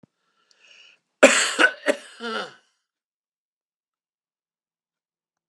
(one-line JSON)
{"cough_length": "5.5 s", "cough_amplitude": 32756, "cough_signal_mean_std_ratio": 0.24, "survey_phase": "beta (2021-08-13 to 2022-03-07)", "age": "65+", "gender": "Male", "wearing_mask": "No", "symptom_none": true, "smoker_status": "Ex-smoker", "respiratory_condition_asthma": false, "respiratory_condition_other": false, "recruitment_source": "REACT", "submission_delay": "2 days", "covid_test_result": "Negative", "covid_test_method": "RT-qPCR", "influenza_a_test_result": "Negative", "influenza_b_test_result": "Negative"}